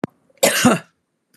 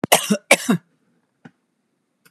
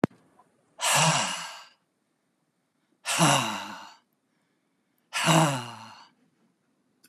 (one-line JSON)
{"three_cough_length": "1.4 s", "three_cough_amplitude": 32716, "three_cough_signal_mean_std_ratio": 0.41, "cough_length": "2.3 s", "cough_amplitude": 32768, "cough_signal_mean_std_ratio": 0.3, "exhalation_length": "7.1 s", "exhalation_amplitude": 16893, "exhalation_signal_mean_std_ratio": 0.39, "survey_phase": "beta (2021-08-13 to 2022-03-07)", "age": "65+", "gender": "Female", "wearing_mask": "No", "symptom_none": true, "smoker_status": "Never smoked", "respiratory_condition_asthma": false, "respiratory_condition_other": false, "recruitment_source": "REACT", "submission_delay": "3 days", "covid_test_result": "Negative", "covid_test_method": "RT-qPCR", "influenza_a_test_result": "Negative", "influenza_b_test_result": "Negative"}